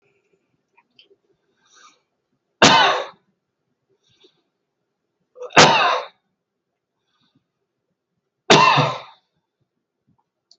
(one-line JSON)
{"three_cough_length": "10.6 s", "three_cough_amplitude": 32768, "three_cough_signal_mean_std_ratio": 0.27, "survey_phase": "beta (2021-08-13 to 2022-03-07)", "age": "65+", "gender": "Male", "wearing_mask": "No", "symptom_none": true, "smoker_status": "Never smoked", "respiratory_condition_asthma": true, "respiratory_condition_other": false, "recruitment_source": "REACT", "submission_delay": "2 days", "covid_test_result": "Negative", "covid_test_method": "RT-qPCR", "influenza_a_test_result": "Negative", "influenza_b_test_result": "Negative"}